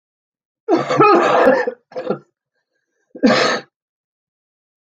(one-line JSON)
{"cough_length": "4.9 s", "cough_amplitude": 29741, "cough_signal_mean_std_ratio": 0.45, "survey_phase": "beta (2021-08-13 to 2022-03-07)", "age": "45-64", "gender": "Female", "wearing_mask": "No", "symptom_cough_any": true, "smoker_status": "Never smoked", "respiratory_condition_asthma": false, "respiratory_condition_other": true, "recruitment_source": "REACT", "submission_delay": "3 days", "covid_test_result": "Negative", "covid_test_method": "RT-qPCR"}